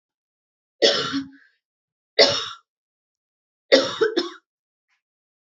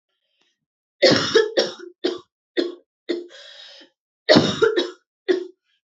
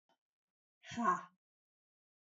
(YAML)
three_cough_length: 5.5 s
three_cough_amplitude: 29321
three_cough_signal_mean_std_ratio: 0.32
cough_length: 6.0 s
cough_amplitude: 27536
cough_signal_mean_std_ratio: 0.4
exhalation_length: 2.2 s
exhalation_amplitude: 3369
exhalation_signal_mean_std_ratio: 0.27
survey_phase: alpha (2021-03-01 to 2021-08-12)
age: 18-44
gender: Female
wearing_mask: 'No'
symptom_cough_any: true
symptom_new_continuous_cough: true
symptom_shortness_of_breath: true
symptom_fever_high_temperature: true
symptom_headache: true
symptom_change_to_sense_of_smell_or_taste: true
symptom_loss_of_taste: true
symptom_onset: 3 days
smoker_status: Never smoked
respiratory_condition_asthma: false
respiratory_condition_other: false
recruitment_source: Test and Trace
submission_delay: 2 days
covid_test_result: Positive
covid_test_method: RT-qPCR